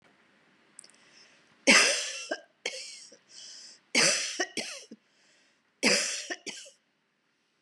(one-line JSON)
{"three_cough_length": "7.6 s", "three_cough_amplitude": 15821, "three_cough_signal_mean_std_ratio": 0.36, "survey_phase": "beta (2021-08-13 to 2022-03-07)", "age": "45-64", "gender": "Female", "wearing_mask": "No", "symptom_shortness_of_breath": true, "symptom_fatigue": true, "symptom_onset": "12 days", "smoker_status": "Never smoked", "respiratory_condition_asthma": false, "respiratory_condition_other": false, "recruitment_source": "REACT", "submission_delay": "2 days", "covid_test_result": "Negative", "covid_test_method": "RT-qPCR", "influenza_a_test_result": "Negative", "influenza_b_test_result": "Negative"}